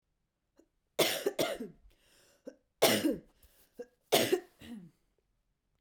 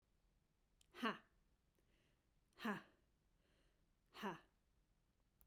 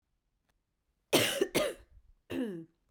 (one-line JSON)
{"three_cough_length": "5.8 s", "three_cough_amplitude": 11350, "three_cough_signal_mean_std_ratio": 0.35, "exhalation_length": "5.5 s", "exhalation_amplitude": 1236, "exhalation_signal_mean_std_ratio": 0.28, "cough_length": "2.9 s", "cough_amplitude": 8573, "cough_signal_mean_std_ratio": 0.4, "survey_phase": "beta (2021-08-13 to 2022-03-07)", "age": "45-64", "gender": "Female", "wearing_mask": "No", "symptom_cough_any": true, "symptom_runny_or_blocked_nose": true, "symptom_sore_throat": true, "symptom_fatigue": true, "symptom_onset": "2 days", "smoker_status": "Never smoked", "respiratory_condition_asthma": false, "respiratory_condition_other": false, "recruitment_source": "Test and Trace", "submission_delay": "2 days", "covid_test_result": "Positive", "covid_test_method": "RT-qPCR"}